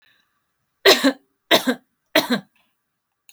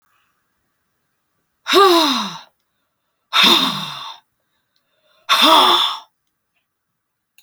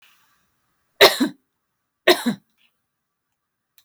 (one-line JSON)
{"three_cough_length": "3.3 s", "three_cough_amplitude": 32767, "three_cough_signal_mean_std_ratio": 0.32, "exhalation_length": "7.4 s", "exhalation_amplitude": 32767, "exhalation_signal_mean_std_ratio": 0.4, "cough_length": "3.8 s", "cough_amplitude": 29718, "cough_signal_mean_std_ratio": 0.23, "survey_phase": "alpha (2021-03-01 to 2021-08-12)", "age": "65+", "gender": "Female", "wearing_mask": "No", "symptom_none": true, "smoker_status": "Never smoked", "respiratory_condition_asthma": false, "respiratory_condition_other": false, "recruitment_source": "REACT", "submission_delay": "2 days", "covid_test_result": "Negative", "covid_test_method": "RT-qPCR"}